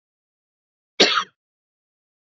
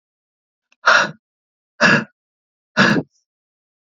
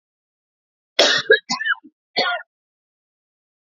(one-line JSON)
{"cough_length": "2.4 s", "cough_amplitude": 27765, "cough_signal_mean_std_ratio": 0.22, "exhalation_length": "3.9 s", "exhalation_amplitude": 29123, "exhalation_signal_mean_std_ratio": 0.33, "three_cough_length": "3.7 s", "three_cough_amplitude": 32768, "three_cough_signal_mean_std_ratio": 0.34, "survey_phase": "beta (2021-08-13 to 2022-03-07)", "age": "18-44", "gender": "Female", "wearing_mask": "No", "symptom_cough_any": true, "symptom_new_continuous_cough": true, "symptom_runny_or_blocked_nose": true, "symptom_headache": true, "symptom_change_to_sense_of_smell_or_taste": true, "symptom_loss_of_taste": true, "smoker_status": "Never smoked", "respiratory_condition_asthma": true, "respiratory_condition_other": false, "recruitment_source": "Test and Trace", "submission_delay": "1 day", "covid_test_result": "Positive", "covid_test_method": "RT-qPCR", "covid_ct_value": 17.6, "covid_ct_gene": "N gene", "covid_ct_mean": 18.8, "covid_viral_load": "690000 copies/ml", "covid_viral_load_category": "Low viral load (10K-1M copies/ml)"}